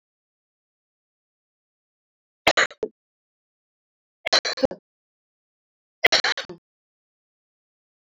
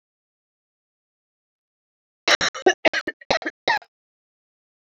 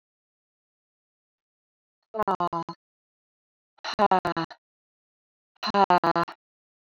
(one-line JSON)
{"three_cough_length": "8.0 s", "three_cough_amplitude": 27375, "three_cough_signal_mean_std_ratio": 0.2, "cough_length": "4.9 s", "cough_amplitude": 22348, "cough_signal_mean_std_ratio": 0.25, "exhalation_length": "6.9 s", "exhalation_amplitude": 14968, "exhalation_signal_mean_std_ratio": 0.28, "survey_phase": "alpha (2021-03-01 to 2021-08-12)", "age": "45-64", "gender": "Female", "wearing_mask": "No", "symptom_cough_any": true, "symptom_fatigue": true, "symptom_headache": true, "smoker_status": "Ex-smoker", "respiratory_condition_asthma": false, "respiratory_condition_other": false, "recruitment_source": "Test and Trace", "submission_delay": "2 days", "covid_test_result": "Positive", "covid_test_method": "RT-qPCR"}